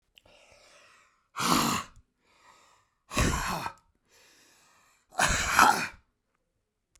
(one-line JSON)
{"exhalation_length": "7.0 s", "exhalation_amplitude": 19821, "exhalation_signal_mean_std_ratio": 0.37, "survey_phase": "beta (2021-08-13 to 2022-03-07)", "age": "45-64", "gender": "Male", "wearing_mask": "No", "symptom_none": true, "smoker_status": "Ex-smoker", "respiratory_condition_asthma": false, "respiratory_condition_other": false, "recruitment_source": "REACT", "submission_delay": "1 day", "covid_test_result": "Negative", "covid_test_method": "RT-qPCR"}